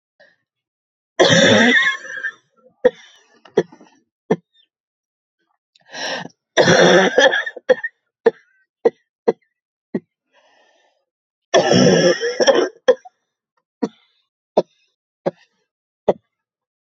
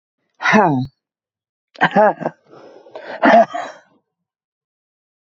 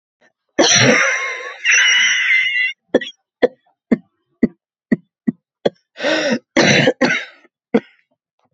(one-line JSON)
{"three_cough_length": "16.9 s", "three_cough_amplitude": 32768, "three_cough_signal_mean_std_ratio": 0.37, "exhalation_length": "5.4 s", "exhalation_amplitude": 32767, "exhalation_signal_mean_std_ratio": 0.36, "cough_length": "8.5 s", "cough_amplitude": 32767, "cough_signal_mean_std_ratio": 0.52, "survey_phase": "beta (2021-08-13 to 2022-03-07)", "age": "45-64", "gender": "Female", "wearing_mask": "No", "symptom_cough_any": true, "symptom_runny_or_blocked_nose": true, "symptom_shortness_of_breath": true, "symptom_fatigue": true, "symptom_headache": true, "symptom_change_to_sense_of_smell_or_taste": true, "symptom_loss_of_taste": true, "smoker_status": "Never smoked", "respiratory_condition_asthma": false, "respiratory_condition_other": false, "recruitment_source": "Test and Trace", "submission_delay": "2 days", "covid_test_result": "Positive", "covid_test_method": "RT-qPCR", "covid_ct_value": 14.9, "covid_ct_gene": "ORF1ab gene", "covid_ct_mean": 15.8, "covid_viral_load": "6700000 copies/ml", "covid_viral_load_category": "High viral load (>1M copies/ml)"}